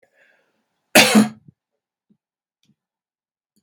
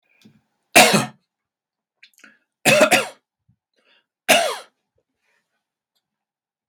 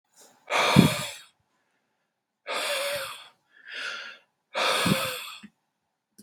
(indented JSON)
{
  "cough_length": "3.6 s",
  "cough_amplitude": 32768,
  "cough_signal_mean_std_ratio": 0.23,
  "three_cough_length": "6.7 s",
  "three_cough_amplitude": 32768,
  "three_cough_signal_mean_std_ratio": 0.28,
  "exhalation_length": "6.2 s",
  "exhalation_amplitude": 32222,
  "exhalation_signal_mean_std_ratio": 0.42,
  "survey_phase": "beta (2021-08-13 to 2022-03-07)",
  "age": "18-44",
  "gender": "Male",
  "wearing_mask": "No",
  "symptom_headache": true,
  "smoker_status": "Ex-smoker",
  "respiratory_condition_asthma": false,
  "respiratory_condition_other": false,
  "recruitment_source": "REACT",
  "submission_delay": "4 days",
  "covid_test_result": "Negative",
  "covid_test_method": "RT-qPCR",
  "influenza_a_test_result": "Negative",
  "influenza_b_test_result": "Negative"
}